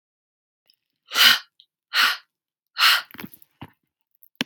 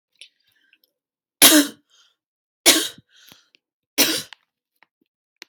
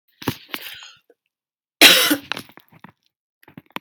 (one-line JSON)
{"exhalation_length": "4.5 s", "exhalation_amplitude": 32767, "exhalation_signal_mean_std_ratio": 0.31, "three_cough_length": "5.5 s", "three_cough_amplitude": 32768, "three_cough_signal_mean_std_ratio": 0.26, "cough_length": "3.8 s", "cough_amplitude": 32767, "cough_signal_mean_std_ratio": 0.27, "survey_phase": "beta (2021-08-13 to 2022-03-07)", "age": "18-44", "gender": "Female", "wearing_mask": "No", "symptom_cough_any": true, "symptom_runny_or_blocked_nose": true, "symptom_shortness_of_breath": true, "symptom_sore_throat": true, "symptom_fatigue": true, "symptom_headache": true, "symptom_change_to_sense_of_smell_or_taste": true, "symptom_onset": "2 days", "smoker_status": "Never smoked", "respiratory_condition_asthma": false, "respiratory_condition_other": false, "recruitment_source": "Test and Trace", "submission_delay": "2 days", "covid_test_result": "Positive", "covid_test_method": "RT-qPCR", "covid_ct_value": 24.8, "covid_ct_gene": "N gene"}